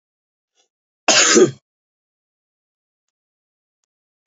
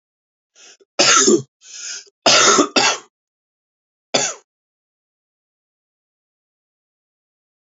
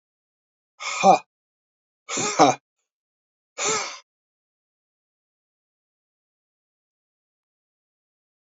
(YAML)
cough_length: 4.3 s
cough_amplitude: 32768
cough_signal_mean_std_ratio: 0.25
three_cough_length: 7.8 s
three_cough_amplitude: 32767
three_cough_signal_mean_std_ratio: 0.32
exhalation_length: 8.4 s
exhalation_amplitude: 26115
exhalation_signal_mean_std_ratio: 0.23
survey_phase: beta (2021-08-13 to 2022-03-07)
age: 18-44
gender: Male
wearing_mask: 'No'
symptom_runny_or_blocked_nose: true
symptom_sore_throat: true
symptom_fatigue: true
symptom_headache: true
symptom_onset: 3 days
smoker_status: Ex-smoker
respiratory_condition_asthma: true
respiratory_condition_other: false
recruitment_source: Test and Trace
submission_delay: 2 days
covid_test_result: Positive
covid_test_method: RT-qPCR
covid_ct_value: 16.3
covid_ct_gene: ORF1ab gene